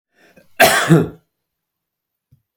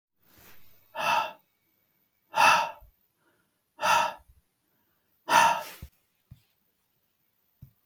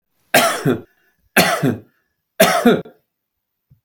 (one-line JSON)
{"cough_length": "2.6 s", "cough_amplitude": 32768, "cough_signal_mean_std_ratio": 0.33, "exhalation_length": "7.9 s", "exhalation_amplitude": 16657, "exhalation_signal_mean_std_ratio": 0.32, "three_cough_length": "3.8 s", "three_cough_amplitude": 32768, "three_cough_signal_mean_std_ratio": 0.43, "survey_phase": "beta (2021-08-13 to 2022-03-07)", "age": "65+", "gender": "Male", "wearing_mask": "No", "symptom_none": true, "smoker_status": "Ex-smoker", "respiratory_condition_asthma": false, "respiratory_condition_other": false, "recruitment_source": "REACT", "submission_delay": "0 days", "covid_test_result": "Negative", "covid_test_method": "RT-qPCR", "influenza_a_test_result": "Negative", "influenza_b_test_result": "Negative"}